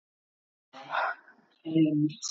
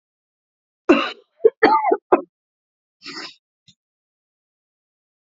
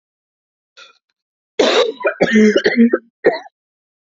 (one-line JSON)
{"exhalation_length": "2.3 s", "exhalation_amplitude": 6293, "exhalation_signal_mean_std_ratio": 0.49, "cough_length": "5.4 s", "cough_amplitude": 27565, "cough_signal_mean_std_ratio": 0.26, "three_cough_length": "4.0 s", "three_cough_amplitude": 30172, "three_cough_signal_mean_std_ratio": 0.46, "survey_phase": "beta (2021-08-13 to 2022-03-07)", "age": "18-44", "gender": "Female", "wearing_mask": "No", "symptom_new_continuous_cough": true, "symptom_runny_or_blocked_nose": true, "symptom_shortness_of_breath": true, "symptom_sore_throat": true, "symptom_fatigue": true, "symptom_fever_high_temperature": true, "symptom_change_to_sense_of_smell_or_taste": true, "symptom_onset": "4 days", "smoker_status": "Never smoked", "respiratory_condition_asthma": false, "respiratory_condition_other": false, "recruitment_source": "Test and Trace", "submission_delay": "2 days", "covid_test_result": "Positive", "covid_test_method": "RT-qPCR", "covid_ct_value": 16.5, "covid_ct_gene": "ORF1ab gene", "covid_ct_mean": 17.2, "covid_viral_load": "2300000 copies/ml", "covid_viral_load_category": "High viral load (>1M copies/ml)"}